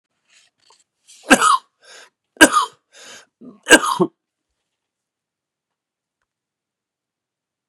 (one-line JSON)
{"three_cough_length": "7.7 s", "three_cough_amplitude": 32768, "three_cough_signal_mean_std_ratio": 0.23, "survey_phase": "beta (2021-08-13 to 2022-03-07)", "age": "45-64", "gender": "Male", "wearing_mask": "No", "symptom_cough_any": true, "symptom_runny_or_blocked_nose": true, "symptom_other": true, "symptom_onset": "5 days", "smoker_status": "Never smoked", "respiratory_condition_asthma": true, "respiratory_condition_other": false, "recruitment_source": "Test and Trace", "submission_delay": "1 day", "covid_test_result": "Negative", "covid_test_method": "RT-qPCR"}